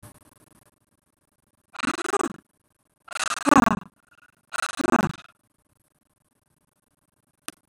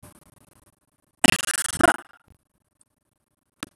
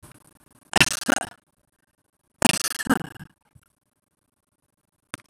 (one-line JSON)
{"exhalation_length": "7.7 s", "exhalation_amplitude": 22830, "exhalation_signal_mean_std_ratio": 0.25, "cough_length": "3.8 s", "cough_amplitude": 26028, "cough_signal_mean_std_ratio": 0.21, "three_cough_length": "5.3 s", "three_cough_amplitude": 26027, "three_cough_signal_mean_std_ratio": 0.23, "survey_phase": "beta (2021-08-13 to 2022-03-07)", "age": "65+", "gender": "Female", "wearing_mask": "No", "symptom_none": true, "smoker_status": "Ex-smoker", "respiratory_condition_asthma": false, "respiratory_condition_other": false, "recruitment_source": "REACT", "submission_delay": "1 day", "covid_test_result": "Negative", "covid_test_method": "RT-qPCR", "influenza_a_test_result": "Negative", "influenza_b_test_result": "Negative"}